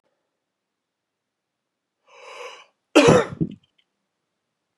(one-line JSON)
{"cough_length": "4.8 s", "cough_amplitude": 27618, "cough_signal_mean_std_ratio": 0.23, "survey_phase": "beta (2021-08-13 to 2022-03-07)", "age": "45-64", "gender": "Male", "wearing_mask": "No", "symptom_runny_or_blocked_nose": true, "smoker_status": "Never smoked", "respiratory_condition_asthma": false, "respiratory_condition_other": false, "recruitment_source": "Test and Trace", "submission_delay": "2 days", "covid_test_result": "Positive", "covid_test_method": "ePCR"}